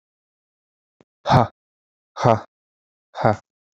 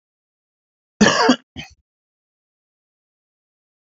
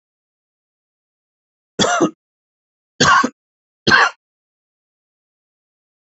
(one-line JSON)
{"exhalation_length": "3.8 s", "exhalation_amplitude": 32767, "exhalation_signal_mean_std_ratio": 0.26, "cough_length": "3.8 s", "cough_amplitude": 28985, "cough_signal_mean_std_ratio": 0.24, "three_cough_length": "6.1 s", "three_cough_amplitude": 32267, "three_cough_signal_mean_std_ratio": 0.28, "survey_phase": "beta (2021-08-13 to 2022-03-07)", "age": "18-44", "gender": "Male", "wearing_mask": "No", "symptom_cough_any": true, "smoker_status": "Current smoker (11 or more cigarettes per day)", "respiratory_condition_asthma": false, "respiratory_condition_other": false, "recruitment_source": "REACT", "submission_delay": "1 day", "covid_test_result": "Negative", "covid_test_method": "RT-qPCR"}